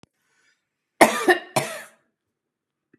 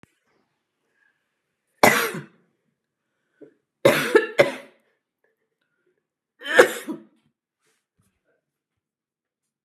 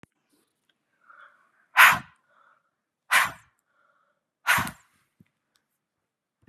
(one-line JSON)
{"cough_length": "3.0 s", "cough_amplitude": 32768, "cough_signal_mean_std_ratio": 0.26, "three_cough_length": "9.6 s", "three_cough_amplitude": 32767, "three_cough_signal_mean_std_ratio": 0.23, "exhalation_length": "6.5 s", "exhalation_amplitude": 29094, "exhalation_signal_mean_std_ratio": 0.22, "survey_phase": "beta (2021-08-13 to 2022-03-07)", "age": "45-64", "gender": "Female", "wearing_mask": "No", "symptom_runny_or_blocked_nose": true, "symptom_headache": true, "symptom_onset": "3 days", "smoker_status": "Never smoked", "respiratory_condition_asthma": false, "respiratory_condition_other": false, "recruitment_source": "Test and Trace", "submission_delay": "2 days", "covid_test_result": "Positive", "covid_test_method": "RT-qPCR", "covid_ct_value": 18.8, "covid_ct_gene": "ORF1ab gene", "covid_ct_mean": 19.1, "covid_viral_load": "560000 copies/ml", "covid_viral_load_category": "Low viral load (10K-1M copies/ml)"}